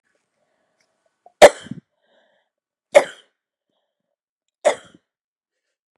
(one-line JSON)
{"three_cough_length": "6.0 s", "three_cough_amplitude": 32768, "three_cough_signal_mean_std_ratio": 0.15, "survey_phase": "beta (2021-08-13 to 2022-03-07)", "age": "45-64", "gender": "Female", "wearing_mask": "No", "symptom_none": true, "smoker_status": "Never smoked", "respiratory_condition_asthma": false, "respiratory_condition_other": false, "recruitment_source": "REACT", "submission_delay": "2 days", "covid_test_result": "Negative", "covid_test_method": "RT-qPCR", "influenza_a_test_result": "Negative", "influenza_b_test_result": "Negative"}